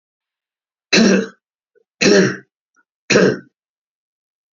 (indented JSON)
{
  "three_cough_length": "4.5 s",
  "three_cough_amplitude": 29536,
  "three_cough_signal_mean_std_ratio": 0.37,
  "survey_phase": "beta (2021-08-13 to 2022-03-07)",
  "age": "65+",
  "gender": "Male",
  "wearing_mask": "No",
  "symptom_none": true,
  "smoker_status": "Never smoked",
  "respiratory_condition_asthma": false,
  "respiratory_condition_other": false,
  "recruitment_source": "REACT",
  "submission_delay": "1 day",
  "covid_test_result": "Negative",
  "covid_test_method": "RT-qPCR",
  "influenza_a_test_result": "Negative",
  "influenza_b_test_result": "Negative"
}